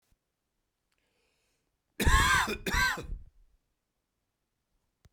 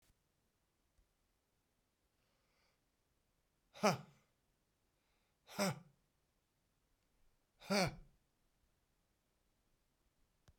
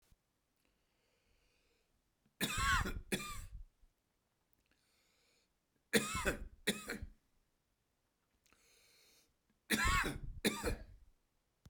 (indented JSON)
{
  "cough_length": "5.1 s",
  "cough_amplitude": 9561,
  "cough_signal_mean_std_ratio": 0.34,
  "exhalation_length": "10.6 s",
  "exhalation_amplitude": 3888,
  "exhalation_signal_mean_std_ratio": 0.19,
  "three_cough_length": "11.7 s",
  "three_cough_amplitude": 4335,
  "three_cough_signal_mean_std_ratio": 0.36,
  "survey_phase": "beta (2021-08-13 to 2022-03-07)",
  "age": "45-64",
  "gender": "Male",
  "wearing_mask": "No",
  "symptom_none": true,
  "symptom_onset": "7 days",
  "smoker_status": "Never smoked",
  "respiratory_condition_asthma": true,
  "respiratory_condition_other": false,
  "recruitment_source": "Test and Trace",
  "submission_delay": "4 days",
  "covid_test_result": "Positive",
  "covid_test_method": "RT-qPCR",
  "covid_ct_value": 11.3,
  "covid_ct_gene": "ORF1ab gene",
  "covid_ct_mean": 11.6,
  "covid_viral_load": "160000000 copies/ml",
  "covid_viral_load_category": "High viral load (>1M copies/ml)"
}